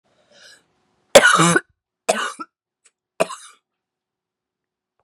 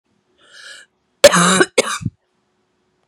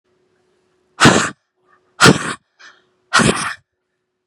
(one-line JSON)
{"three_cough_length": "5.0 s", "three_cough_amplitude": 32768, "three_cough_signal_mean_std_ratio": 0.26, "cough_length": "3.1 s", "cough_amplitude": 32768, "cough_signal_mean_std_ratio": 0.32, "exhalation_length": "4.3 s", "exhalation_amplitude": 32768, "exhalation_signal_mean_std_ratio": 0.34, "survey_phase": "beta (2021-08-13 to 2022-03-07)", "age": "18-44", "gender": "Female", "wearing_mask": "No", "symptom_cough_any": true, "symptom_new_continuous_cough": true, "symptom_runny_or_blocked_nose": true, "symptom_shortness_of_breath": true, "symptom_sore_throat": true, "symptom_diarrhoea": true, "symptom_fatigue": true, "symptom_fever_high_temperature": true, "symptom_headache": true, "symptom_change_to_sense_of_smell_or_taste": true, "symptom_onset": "3 days", "smoker_status": "Ex-smoker", "respiratory_condition_asthma": false, "respiratory_condition_other": false, "recruitment_source": "Test and Trace", "submission_delay": "1 day", "covid_test_result": "Positive", "covid_test_method": "RT-qPCR", "covid_ct_value": 20.4, "covid_ct_gene": "ORF1ab gene", "covid_ct_mean": 20.4, "covid_viral_load": "200000 copies/ml", "covid_viral_load_category": "Low viral load (10K-1M copies/ml)"}